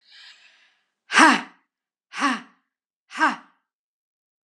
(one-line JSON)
{"exhalation_length": "4.5 s", "exhalation_amplitude": 31759, "exhalation_signal_mean_std_ratio": 0.28, "survey_phase": "alpha (2021-03-01 to 2021-08-12)", "age": "45-64", "gender": "Female", "wearing_mask": "No", "symptom_none": true, "smoker_status": "Never smoked", "respiratory_condition_asthma": true, "respiratory_condition_other": false, "recruitment_source": "REACT", "submission_delay": "1 day", "covid_test_result": "Negative", "covid_test_method": "RT-qPCR"}